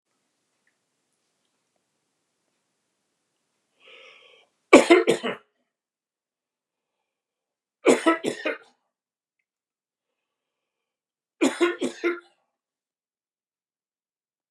{"three_cough_length": "14.5 s", "three_cough_amplitude": 29204, "three_cough_signal_mean_std_ratio": 0.21, "survey_phase": "beta (2021-08-13 to 2022-03-07)", "age": "65+", "gender": "Male", "wearing_mask": "No", "symptom_none": true, "smoker_status": "Never smoked", "respiratory_condition_asthma": false, "respiratory_condition_other": false, "recruitment_source": "REACT", "submission_delay": "1 day", "covid_test_result": "Negative", "covid_test_method": "RT-qPCR", "influenza_a_test_result": "Negative", "influenza_b_test_result": "Negative"}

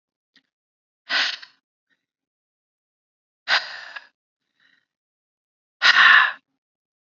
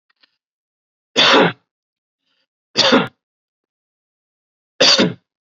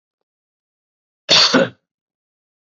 {"exhalation_length": "7.1 s", "exhalation_amplitude": 28350, "exhalation_signal_mean_std_ratio": 0.26, "three_cough_length": "5.5 s", "three_cough_amplitude": 31706, "three_cough_signal_mean_std_ratio": 0.33, "cough_length": "2.7 s", "cough_amplitude": 32380, "cough_signal_mean_std_ratio": 0.29, "survey_phase": "beta (2021-08-13 to 2022-03-07)", "age": "18-44", "gender": "Male", "wearing_mask": "No", "symptom_abdominal_pain": true, "symptom_fatigue": true, "symptom_headache": true, "symptom_onset": "12 days", "smoker_status": "Ex-smoker", "respiratory_condition_asthma": false, "respiratory_condition_other": false, "recruitment_source": "REACT", "submission_delay": "4 days", "covid_test_result": "Negative", "covid_test_method": "RT-qPCR", "influenza_a_test_result": "Negative", "influenza_b_test_result": "Negative"}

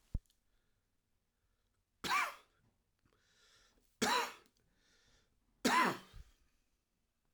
{"three_cough_length": "7.3 s", "three_cough_amplitude": 3681, "three_cough_signal_mean_std_ratio": 0.29, "survey_phase": "alpha (2021-03-01 to 2021-08-12)", "age": "45-64", "gender": "Male", "wearing_mask": "No", "symptom_new_continuous_cough": true, "symptom_shortness_of_breath": true, "symptom_onset": "6 days", "smoker_status": "Current smoker (e-cigarettes or vapes only)", "respiratory_condition_asthma": false, "respiratory_condition_other": false, "recruitment_source": "Test and Trace", "submission_delay": "2 days", "covid_test_result": "Positive", "covid_test_method": "RT-qPCR", "covid_ct_value": 15.8, "covid_ct_gene": "ORF1ab gene", "covid_ct_mean": 16.1, "covid_viral_load": "5300000 copies/ml", "covid_viral_load_category": "High viral load (>1M copies/ml)"}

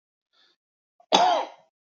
{"three_cough_length": "1.9 s", "three_cough_amplitude": 29740, "three_cough_signal_mean_std_ratio": 0.34, "survey_phase": "beta (2021-08-13 to 2022-03-07)", "age": "45-64", "gender": "Male", "wearing_mask": "No", "symptom_none": true, "smoker_status": "Never smoked", "respiratory_condition_asthma": false, "respiratory_condition_other": false, "recruitment_source": "REACT", "submission_delay": "2 days", "covid_test_result": "Negative", "covid_test_method": "RT-qPCR", "influenza_a_test_result": "Negative", "influenza_b_test_result": "Negative"}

